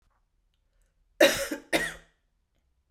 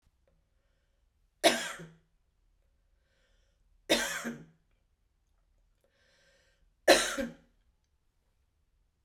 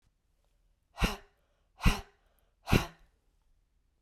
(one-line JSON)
{"cough_length": "2.9 s", "cough_amplitude": 21014, "cough_signal_mean_std_ratio": 0.28, "three_cough_length": "9.0 s", "three_cough_amplitude": 15277, "three_cough_signal_mean_std_ratio": 0.23, "exhalation_length": "4.0 s", "exhalation_amplitude": 10809, "exhalation_signal_mean_std_ratio": 0.23, "survey_phase": "beta (2021-08-13 to 2022-03-07)", "age": "45-64", "gender": "Female", "wearing_mask": "No", "symptom_runny_or_blocked_nose": true, "symptom_onset": "12 days", "smoker_status": "Never smoked", "respiratory_condition_asthma": false, "respiratory_condition_other": false, "recruitment_source": "REACT", "submission_delay": "5 days", "covid_test_result": "Negative", "covid_test_method": "RT-qPCR"}